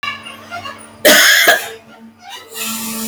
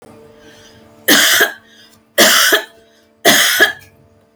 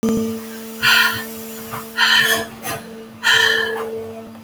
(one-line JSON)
{"cough_length": "3.1 s", "cough_amplitude": 32768, "cough_signal_mean_std_ratio": 0.53, "three_cough_length": "4.4 s", "three_cough_amplitude": 32768, "three_cough_signal_mean_std_ratio": 0.49, "exhalation_length": "4.4 s", "exhalation_amplitude": 26368, "exhalation_signal_mean_std_ratio": 0.72, "survey_phase": "beta (2021-08-13 to 2022-03-07)", "age": "45-64", "gender": "Female", "wearing_mask": "No", "symptom_cough_any": true, "smoker_status": "Current smoker (11 or more cigarettes per day)", "respiratory_condition_asthma": false, "respiratory_condition_other": false, "recruitment_source": "REACT", "submission_delay": "2 days", "covid_test_result": "Negative", "covid_test_method": "RT-qPCR"}